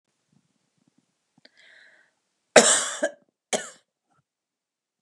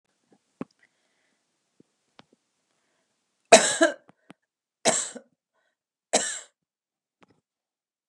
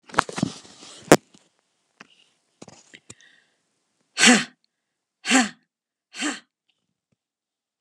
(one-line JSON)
{"cough_length": "5.0 s", "cough_amplitude": 32761, "cough_signal_mean_std_ratio": 0.21, "three_cough_length": "8.1 s", "three_cough_amplitude": 31333, "three_cough_signal_mean_std_ratio": 0.19, "exhalation_length": "7.8 s", "exhalation_amplitude": 32768, "exhalation_signal_mean_std_ratio": 0.22, "survey_phase": "beta (2021-08-13 to 2022-03-07)", "age": "45-64", "gender": "Female", "wearing_mask": "No", "symptom_none": true, "smoker_status": "Never smoked", "respiratory_condition_asthma": false, "respiratory_condition_other": false, "recruitment_source": "REACT", "submission_delay": "2 days", "covid_test_result": "Negative", "covid_test_method": "RT-qPCR"}